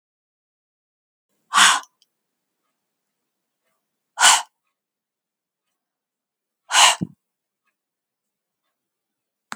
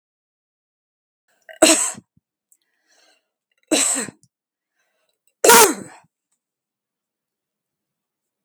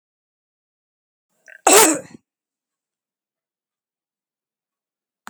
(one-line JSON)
{"exhalation_length": "9.6 s", "exhalation_amplitude": 32767, "exhalation_signal_mean_std_ratio": 0.21, "three_cough_length": "8.4 s", "three_cough_amplitude": 32768, "three_cough_signal_mean_std_ratio": 0.24, "cough_length": "5.3 s", "cough_amplitude": 32768, "cough_signal_mean_std_ratio": 0.19, "survey_phase": "beta (2021-08-13 to 2022-03-07)", "age": "65+", "gender": "Female", "wearing_mask": "No", "symptom_none": true, "smoker_status": "Never smoked", "respiratory_condition_asthma": false, "respiratory_condition_other": false, "recruitment_source": "REACT", "submission_delay": "2 days", "covid_test_result": "Negative", "covid_test_method": "RT-qPCR", "influenza_a_test_result": "Negative", "influenza_b_test_result": "Negative"}